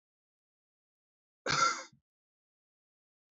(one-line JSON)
{"cough_length": "3.3 s", "cough_amplitude": 4680, "cough_signal_mean_std_ratio": 0.24, "survey_phase": "beta (2021-08-13 to 2022-03-07)", "age": "18-44", "gender": "Male", "wearing_mask": "No", "symptom_cough_any": true, "symptom_runny_or_blocked_nose": true, "symptom_fatigue": true, "symptom_fever_high_temperature": true, "symptom_headache": true, "smoker_status": "Current smoker (1 to 10 cigarettes per day)", "respiratory_condition_asthma": false, "respiratory_condition_other": false, "recruitment_source": "Test and Trace", "submission_delay": "1 day", "covid_test_result": "Positive", "covid_test_method": "RT-qPCR", "covid_ct_value": 27.6, "covid_ct_gene": "ORF1ab gene", "covid_ct_mean": 28.2, "covid_viral_load": "550 copies/ml", "covid_viral_load_category": "Minimal viral load (< 10K copies/ml)"}